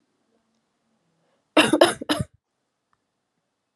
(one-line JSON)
{"three_cough_length": "3.8 s", "three_cough_amplitude": 29162, "three_cough_signal_mean_std_ratio": 0.24, "survey_phase": "alpha (2021-03-01 to 2021-08-12)", "age": "18-44", "gender": "Female", "wearing_mask": "No", "symptom_cough_any": true, "symptom_fever_high_temperature": true, "symptom_headache": true, "smoker_status": "Never smoked", "respiratory_condition_asthma": false, "respiratory_condition_other": false, "recruitment_source": "Test and Trace", "submission_delay": "2 days", "covid_test_result": "Positive", "covid_test_method": "RT-qPCR", "covid_ct_value": 18.4, "covid_ct_gene": "ORF1ab gene", "covid_ct_mean": 18.8, "covid_viral_load": "670000 copies/ml", "covid_viral_load_category": "Low viral load (10K-1M copies/ml)"}